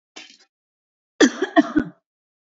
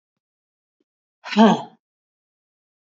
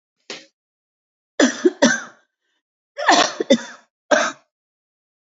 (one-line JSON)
{"cough_length": "2.6 s", "cough_amplitude": 29652, "cough_signal_mean_std_ratio": 0.28, "exhalation_length": "2.9 s", "exhalation_amplitude": 26572, "exhalation_signal_mean_std_ratio": 0.22, "three_cough_length": "5.3 s", "three_cough_amplitude": 32318, "three_cough_signal_mean_std_ratio": 0.34, "survey_phase": "beta (2021-08-13 to 2022-03-07)", "age": "45-64", "gender": "Female", "wearing_mask": "Yes", "symptom_none": true, "symptom_onset": "5 days", "smoker_status": "Ex-smoker", "respiratory_condition_asthma": false, "respiratory_condition_other": false, "recruitment_source": "REACT", "submission_delay": "1 day", "covid_test_result": "Negative", "covid_test_method": "RT-qPCR", "influenza_a_test_result": "Negative", "influenza_b_test_result": "Negative"}